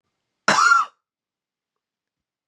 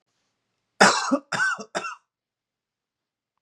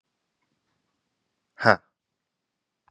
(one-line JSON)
{"cough_length": "2.5 s", "cough_amplitude": 26350, "cough_signal_mean_std_ratio": 0.32, "three_cough_length": "3.4 s", "three_cough_amplitude": 31158, "three_cough_signal_mean_std_ratio": 0.32, "exhalation_length": "2.9 s", "exhalation_amplitude": 31558, "exhalation_signal_mean_std_ratio": 0.12, "survey_phase": "beta (2021-08-13 to 2022-03-07)", "age": "18-44", "gender": "Male", "wearing_mask": "No", "symptom_cough_any": true, "symptom_new_continuous_cough": true, "symptom_runny_or_blocked_nose": true, "symptom_sore_throat": true, "symptom_change_to_sense_of_smell_or_taste": true, "symptom_onset": "7 days", "smoker_status": "Never smoked", "respiratory_condition_asthma": false, "respiratory_condition_other": false, "recruitment_source": "Test and Trace", "submission_delay": "2 days", "covid_test_result": "Positive", "covid_test_method": "RT-qPCR", "covid_ct_value": 30.4, "covid_ct_gene": "ORF1ab gene"}